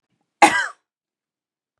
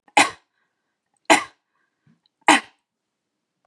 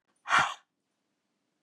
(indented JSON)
{
  "cough_length": "1.8 s",
  "cough_amplitude": 32767,
  "cough_signal_mean_std_ratio": 0.25,
  "three_cough_length": "3.7 s",
  "three_cough_amplitude": 32767,
  "three_cough_signal_mean_std_ratio": 0.23,
  "exhalation_length": "1.6 s",
  "exhalation_amplitude": 7882,
  "exhalation_signal_mean_std_ratio": 0.29,
  "survey_phase": "beta (2021-08-13 to 2022-03-07)",
  "age": "45-64",
  "gender": "Female",
  "wearing_mask": "No",
  "symptom_none": true,
  "smoker_status": "Never smoked",
  "respiratory_condition_asthma": false,
  "respiratory_condition_other": false,
  "recruitment_source": "REACT",
  "submission_delay": "1 day",
  "covid_test_result": "Positive",
  "covid_test_method": "RT-qPCR",
  "covid_ct_value": 37.0,
  "covid_ct_gene": "N gene",
  "influenza_a_test_result": "Negative",
  "influenza_b_test_result": "Negative"
}